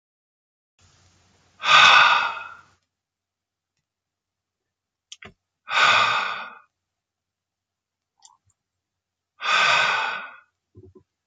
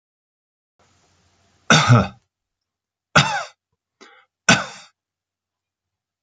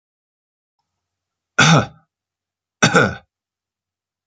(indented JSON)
{
  "exhalation_length": "11.3 s",
  "exhalation_amplitude": 29508,
  "exhalation_signal_mean_std_ratio": 0.33,
  "three_cough_length": "6.2 s",
  "three_cough_amplitude": 32767,
  "three_cough_signal_mean_std_ratio": 0.26,
  "cough_length": "4.3 s",
  "cough_amplitude": 31665,
  "cough_signal_mean_std_ratio": 0.28,
  "survey_phase": "beta (2021-08-13 to 2022-03-07)",
  "age": "45-64",
  "gender": "Male",
  "wearing_mask": "No",
  "symptom_none": true,
  "smoker_status": "Never smoked",
  "respiratory_condition_asthma": false,
  "respiratory_condition_other": false,
  "recruitment_source": "Test and Trace",
  "submission_delay": "2 days",
  "covid_test_result": "Positive",
  "covid_test_method": "RT-qPCR",
  "covid_ct_value": 20.0,
  "covid_ct_gene": "N gene",
  "covid_ct_mean": 20.9,
  "covid_viral_load": "140000 copies/ml",
  "covid_viral_load_category": "Low viral load (10K-1M copies/ml)"
}